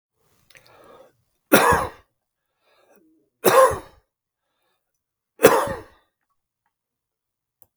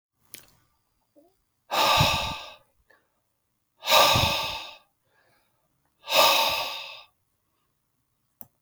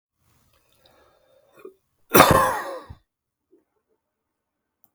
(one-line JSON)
{"three_cough_length": "7.8 s", "three_cough_amplitude": 32768, "three_cough_signal_mean_std_ratio": 0.26, "exhalation_length": "8.6 s", "exhalation_amplitude": 19892, "exhalation_signal_mean_std_ratio": 0.39, "cough_length": "4.9 s", "cough_amplitude": 32768, "cough_signal_mean_std_ratio": 0.24, "survey_phase": "beta (2021-08-13 to 2022-03-07)", "age": "65+", "gender": "Male", "wearing_mask": "No", "symptom_none": true, "smoker_status": "Current smoker (1 to 10 cigarettes per day)", "respiratory_condition_asthma": false, "respiratory_condition_other": false, "recruitment_source": "REACT", "submission_delay": "2 days", "covid_test_result": "Negative", "covid_test_method": "RT-qPCR", "influenza_a_test_result": "Negative", "influenza_b_test_result": "Negative"}